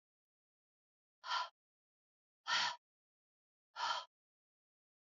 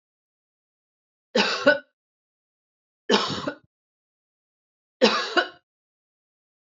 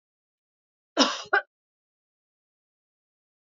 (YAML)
exhalation_length: 5.0 s
exhalation_amplitude: 2157
exhalation_signal_mean_std_ratio: 0.3
three_cough_length: 6.7 s
three_cough_amplitude: 24646
three_cough_signal_mean_std_ratio: 0.29
cough_length: 3.6 s
cough_amplitude: 20028
cough_signal_mean_std_ratio: 0.2
survey_phase: alpha (2021-03-01 to 2021-08-12)
age: 45-64
gender: Female
wearing_mask: 'No'
symptom_cough_any: true
symptom_fatigue: true
symptom_headache: true
symptom_change_to_sense_of_smell_or_taste: true
symptom_loss_of_taste: true
symptom_onset: 4 days
smoker_status: Ex-smoker
respiratory_condition_asthma: false
respiratory_condition_other: false
recruitment_source: Test and Trace
submission_delay: 1 day
covid_test_result: Positive
covid_test_method: RT-qPCR